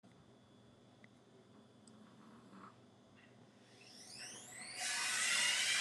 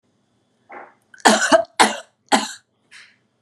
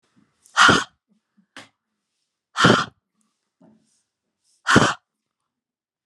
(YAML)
three_cough_length: 5.8 s
three_cough_amplitude: 2292
three_cough_signal_mean_std_ratio: 0.47
cough_length: 3.4 s
cough_amplitude: 32768
cough_signal_mean_std_ratio: 0.33
exhalation_length: 6.1 s
exhalation_amplitude: 31028
exhalation_signal_mean_std_ratio: 0.28
survey_phase: beta (2021-08-13 to 2022-03-07)
age: 45-64
gender: Female
wearing_mask: 'No'
symptom_none: true
smoker_status: Ex-smoker
respiratory_condition_asthma: false
respiratory_condition_other: false
recruitment_source: REACT
submission_delay: 1 day
covid_test_result: Negative
covid_test_method: RT-qPCR